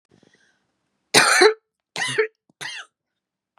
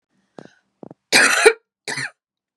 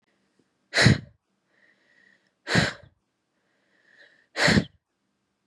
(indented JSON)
{
  "three_cough_length": "3.6 s",
  "three_cough_amplitude": 32767,
  "three_cough_signal_mean_std_ratio": 0.33,
  "cough_length": "2.6 s",
  "cough_amplitude": 32767,
  "cough_signal_mean_std_ratio": 0.34,
  "exhalation_length": "5.5 s",
  "exhalation_amplitude": 20653,
  "exhalation_signal_mean_std_ratio": 0.28,
  "survey_phase": "beta (2021-08-13 to 2022-03-07)",
  "age": "18-44",
  "gender": "Female",
  "wearing_mask": "No",
  "symptom_cough_any": true,
  "symptom_abdominal_pain": true,
  "symptom_fatigue": true,
  "symptom_headache": true,
  "smoker_status": "Never smoked",
  "respiratory_condition_asthma": false,
  "respiratory_condition_other": false,
  "recruitment_source": "Test and Trace",
  "submission_delay": "2 days",
  "covid_test_result": "Positive",
  "covid_test_method": "RT-qPCR"
}